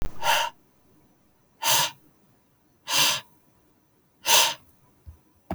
exhalation_length: 5.5 s
exhalation_amplitude: 19008
exhalation_signal_mean_std_ratio: 0.4
survey_phase: alpha (2021-03-01 to 2021-08-12)
age: 18-44
gender: Male
wearing_mask: 'No'
symptom_none: true
smoker_status: Never smoked
respiratory_condition_asthma: false
respiratory_condition_other: false
recruitment_source: REACT
submission_delay: 1 day
covid_test_result: Negative
covid_test_method: RT-qPCR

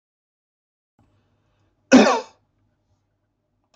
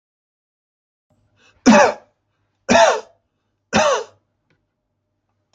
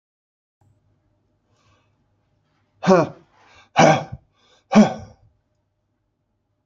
cough_length: 3.8 s
cough_amplitude: 29282
cough_signal_mean_std_ratio: 0.21
three_cough_length: 5.5 s
three_cough_amplitude: 28379
three_cough_signal_mean_std_ratio: 0.31
exhalation_length: 6.7 s
exhalation_amplitude: 31300
exhalation_signal_mean_std_ratio: 0.24
survey_phase: alpha (2021-03-01 to 2021-08-12)
age: 65+
gender: Male
wearing_mask: 'No'
symptom_none: true
smoker_status: Ex-smoker
respiratory_condition_asthma: false
respiratory_condition_other: false
recruitment_source: REACT
submission_delay: 1 day
covid_test_result: Negative
covid_test_method: RT-qPCR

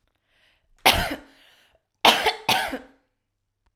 cough_length: 3.8 s
cough_amplitude: 32767
cough_signal_mean_std_ratio: 0.33
survey_phase: alpha (2021-03-01 to 2021-08-12)
age: 18-44
gender: Female
wearing_mask: 'No'
symptom_none: true
smoker_status: Current smoker (11 or more cigarettes per day)
respiratory_condition_asthma: false
respiratory_condition_other: false
recruitment_source: REACT
submission_delay: 1 day
covid_test_result: Negative
covid_test_method: RT-qPCR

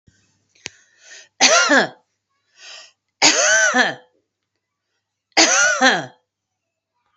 three_cough_length: 7.2 s
three_cough_amplitude: 32767
three_cough_signal_mean_std_ratio: 0.42
survey_phase: beta (2021-08-13 to 2022-03-07)
age: 45-64
gender: Female
wearing_mask: 'No'
symptom_none: true
smoker_status: Never smoked
respiratory_condition_asthma: false
respiratory_condition_other: false
recruitment_source: REACT
submission_delay: 3 days
covid_test_result: Negative
covid_test_method: RT-qPCR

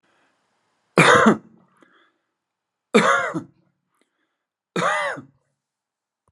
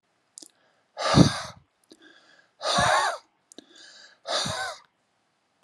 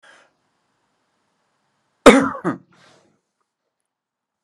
three_cough_length: 6.3 s
three_cough_amplitude: 32458
three_cough_signal_mean_std_ratio: 0.32
exhalation_length: 5.6 s
exhalation_amplitude: 26454
exhalation_signal_mean_std_ratio: 0.36
cough_length: 4.4 s
cough_amplitude: 32768
cough_signal_mean_std_ratio: 0.19
survey_phase: alpha (2021-03-01 to 2021-08-12)
age: 45-64
gender: Male
wearing_mask: 'No'
symptom_none: true
smoker_status: Never smoked
respiratory_condition_asthma: false
respiratory_condition_other: false
recruitment_source: REACT
submission_delay: 4 days
covid_test_result: Negative
covid_test_method: RT-qPCR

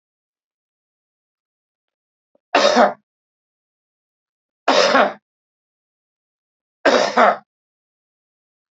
three_cough_length: 8.7 s
three_cough_amplitude: 29985
three_cough_signal_mean_std_ratio: 0.29
survey_phase: beta (2021-08-13 to 2022-03-07)
age: 65+
gender: Male
wearing_mask: 'No'
symptom_none: true
smoker_status: Ex-smoker
respiratory_condition_asthma: false
respiratory_condition_other: false
recruitment_source: REACT
submission_delay: 2 days
covid_test_result: Negative
covid_test_method: RT-qPCR
influenza_a_test_result: Negative
influenza_b_test_result: Negative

